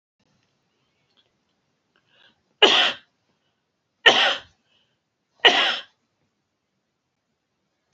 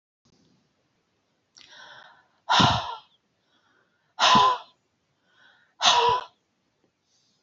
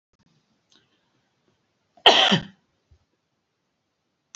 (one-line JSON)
{"three_cough_length": "7.9 s", "three_cough_amplitude": 32767, "three_cough_signal_mean_std_ratio": 0.25, "exhalation_length": "7.4 s", "exhalation_amplitude": 18147, "exhalation_signal_mean_std_ratio": 0.33, "cough_length": "4.4 s", "cough_amplitude": 28498, "cough_signal_mean_std_ratio": 0.21, "survey_phase": "beta (2021-08-13 to 2022-03-07)", "age": "65+", "gender": "Female", "wearing_mask": "No", "symptom_none": true, "smoker_status": "Never smoked", "respiratory_condition_asthma": false, "respiratory_condition_other": false, "recruitment_source": "REACT", "submission_delay": "1 day", "covid_test_result": "Negative", "covid_test_method": "RT-qPCR"}